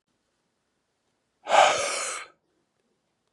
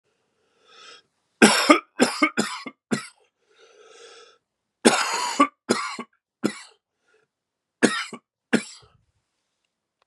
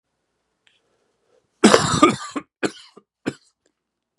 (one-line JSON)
{"exhalation_length": "3.3 s", "exhalation_amplitude": 18318, "exhalation_signal_mean_std_ratio": 0.31, "three_cough_length": "10.1 s", "three_cough_amplitude": 32580, "three_cough_signal_mean_std_ratio": 0.31, "cough_length": "4.2 s", "cough_amplitude": 32768, "cough_signal_mean_std_ratio": 0.28, "survey_phase": "beta (2021-08-13 to 2022-03-07)", "age": "45-64", "gender": "Male", "wearing_mask": "No", "symptom_cough_any": true, "symptom_runny_or_blocked_nose": true, "symptom_sore_throat": true, "symptom_fatigue": true, "symptom_headache": true, "symptom_other": true, "smoker_status": "Ex-smoker", "respiratory_condition_asthma": false, "respiratory_condition_other": false, "recruitment_source": "Test and Trace", "submission_delay": "2 days", "covid_test_result": "Positive", "covid_test_method": "RT-qPCR", "covid_ct_value": 17.4, "covid_ct_gene": "ORF1ab gene", "covid_ct_mean": 17.5, "covid_viral_load": "1900000 copies/ml", "covid_viral_load_category": "High viral load (>1M copies/ml)"}